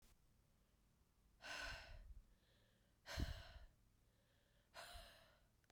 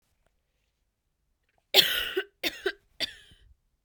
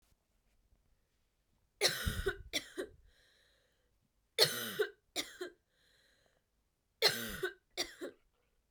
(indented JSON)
{
  "exhalation_length": "5.7 s",
  "exhalation_amplitude": 877,
  "exhalation_signal_mean_std_ratio": 0.45,
  "cough_length": "3.8 s",
  "cough_amplitude": 25594,
  "cough_signal_mean_std_ratio": 0.28,
  "three_cough_length": "8.7 s",
  "three_cough_amplitude": 8911,
  "three_cough_signal_mean_std_ratio": 0.33,
  "survey_phase": "beta (2021-08-13 to 2022-03-07)",
  "age": "18-44",
  "gender": "Female",
  "wearing_mask": "No",
  "symptom_cough_any": true,
  "symptom_new_continuous_cough": true,
  "symptom_runny_or_blocked_nose": true,
  "symptom_shortness_of_breath": true,
  "symptom_fatigue": true,
  "symptom_headache": true,
  "symptom_change_to_sense_of_smell_or_taste": true,
  "symptom_loss_of_taste": true,
  "symptom_onset": "3 days",
  "smoker_status": "Never smoked",
  "respiratory_condition_asthma": false,
  "respiratory_condition_other": false,
  "recruitment_source": "Test and Trace",
  "submission_delay": "1 day",
  "covid_test_result": "Positive",
  "covid_test_method": "ePCR"
}